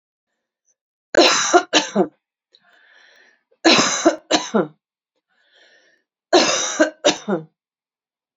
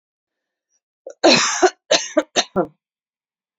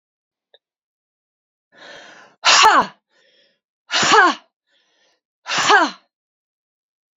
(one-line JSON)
{"three_cough_length": "8.4 s", "three_cough_amplitude": 32544, "three_cough_signal_mean_std_ratio": 0.39, "cough_length": "3.6 s", "cough_amplitude": 30955, "cough_signal_mean_std_ratio": 0.35, "exhalation_length": "7.2 s", "exhalation_amplitude": 32674, "exhalation_signal_mean_std_ratio": 0.33, "survey_phase": "alpha (2021-03-01 to 2021-08-12)", "age": "45-64", "gender": "Female", "wearing_mask": "No", "symptom_none": true, "smoker_status": "Never smoked", "respiratory_condition_asthma": true, "respiratory_condition_other": false, "recruitment_source": "REACT", "submission_delay": "4 days", "covid_test_result": "Negative", "covid_test_method": "RT-qPCR"}